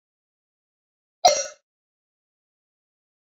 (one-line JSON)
{"cough_length": "3.3 s", "cough_amplitude": 23026, "cough_signal_mean_std_ratio": 0.17, "survey_phase": "beta (2021-08-13 to 2022-03-07)", "age": "45-64", "gender": "Female", "wearing_mask": "No", "symptom_none": true, "smoker_status": "Never smoked", "respiratory_condition_asthma": false, "respiratory_condition_other": false, "recruitment_source": "REACT", "submission_delay": "1 day", "covid_test_result": "Negative", "covid_test_method": "RT-qPCR"}